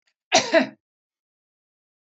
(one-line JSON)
{"cough_length": "2.1 s", "cough_amplitude": 25037, "cough_signal_mean_std_ratio": 0.27, "survey_phase": "beta (2021-08-13 to 2022-03-07)", "age": "45-64", "gender": "Female", "wearing_mask": "No", "symptom_none": true, "smoker_status": "Never smoked", "respiratory_condition_asthma": false, "respiratory_condition_other": false, "recruitment_source": "REACT", "submission_delay": "2 days", "covid_test_result": "Negative", "covid_test_method": "RT-qPCR", "influenza_a_test_result": "Negative", "influenza_b_test_result": "Negative"}